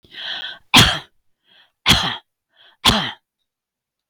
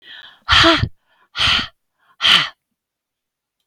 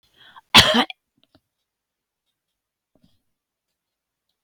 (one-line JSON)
{"three_cough_length": "4.1 s", "three_cough_amplitude": 32768, "three_cough_signal_mean_std_ratio": 0.35, "exhalation_length": "3.7 s", "exhalation_amplitude": 32768, "exhalation_signal_mean_std_ratio": 0.4, "cough_length": "4.4 s", "cough_amplitude": 32768, "cough_signal_mean_std_ratio": 0.19, "survey_phase": "beta (2021-08-13 to 2022-03-07)", "age": "65+", "gender": "Female", "wearing_mask": "No", "symptom_none": true, "smoker_status": "Never smoked", "respiratory_condition_asthma": false, "respiratory_condition_other": false, "recruitment_source": "REACT", "submission_delay": "2 days", "covid_test_result": "Negative", "covid_test_method": "RT-qPCR"}